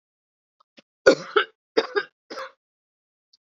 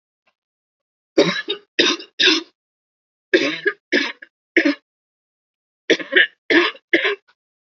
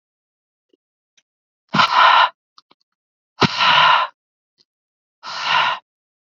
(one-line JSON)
{"cough_length": "3.5 s", "cough_amplitude": 32617, "cough_signal_mean_std_ratio": 0.24, "three_cough_length": "7.7 s", "three_cough_amplitude": 28619, "three_cough_signal_mean_std_ratio": 0.39, "exhalation_length": "6.4 s", "exhalation_amplitude": 28890, "exhalation_signal_mean_std_ratio": 0.39, "survey_phase": "beta (2021-08-13 to 2022-03-07)", "age": "18-44", "gender": "Female", "wearing_mask": "No", "symptom_fatigue": true, "symptom_headache": true, "smoker_status": "Never smoked", "respiratory_condition_asthma": false, "respiratory_condition_other": false, "recruitment_source": "Test and Trace", "submission_delay": "1 day", "covid_test_result": "Positive", "covid_test_method": "RT-qPCR", "covid_ct_value": 19.7, "covid_ct_gene": "ORF1ab gene", "covid_ct_mean": 20.3, "covid_viral_load": "210000 copies/ml", "covid_viral_load_category": "Low viral load (10K-1M copies/ml)"}